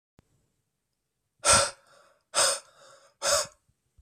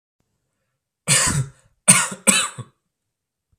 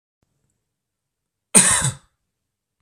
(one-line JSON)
{"exhalation_length": "4.0 s", "exhalation_amplitude": 18314, "exhalation_signal_mean_std_ratio": 0.33, "three_cough_length": "3.6 s", "three_cough_amplitude": 32768, "three_cough_signal_mean_std_ratio": 0.36, "cough_length": "2.8 s", "cough_amplitude": 32768, "cough_signal_mean_std_ratio": 0.26, "survey_phase": "beta (2021-08-13 to 2022-03-07)", "age": "18-44", "gender": "Male", "wearing_mask": "No", "symptom_none": true, "smoker_status": "Never smoked", "respiratory_condition_asthma": false, "respiratory_condition_other": false, "recruitment_source": "REACT", "submission_delay": "1 day", "covid_test_result": "Negative", "covid_test_method": "RT-qPCR"}